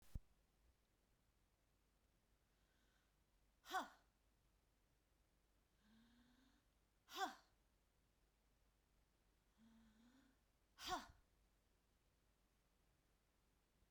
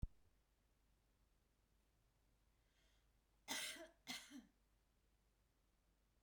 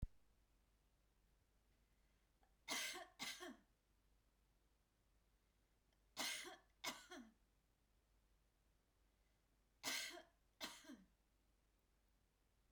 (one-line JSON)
{"exhalation_length": "13.9 s", "exhalation_amplitude": 679, "exhalation_signal_mean_std_ratio": 0.25, "cough_length": "6.2 s", "cough_amplitude": 818, "cough_signal_mean_std_ratio": 0.31, "three_cough_length": "12.7 s", "three_cough_amplitude": 773, "three_cough_signal_mean_std_ratio": 0.35, "survey_phase": "beta (2021-08-13 to 2022-03-07)", "age": "65+", "gender": "Female", "wearing_mask": "No", "symptom_headache": true, "smoker_status": "Ex-smoker", "respiratory_condition_asthma": false, "respiratory_condition_other": false, "recruitment_source": "REACT", "submission_delay": "1 day", "covid_test_result": "Negative", "covid_test_method": "RT-qPCR", "influenza_a_test_result": "Negative", "influenza_b_test_result": "Negative"}